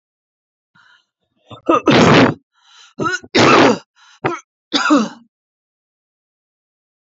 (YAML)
three_cough_length: 7.1 s
three_cough_amplitude: 32768
three_cough_signal_mean_std_ratio: 0.39
survey_phase: alpha (2021-03-01 to 2021-08-12)
age: 65+
gender: Female
wearing_mask: 'No'
symptom_headache: true
smoker_status: Never smoked
respiratory_condition_asthma: false
respiratory_condition_other: false
recruitment_source: REACT
submission_delay: 1 day
covid_test_result: Negative
covid_test_method: RT-qPCR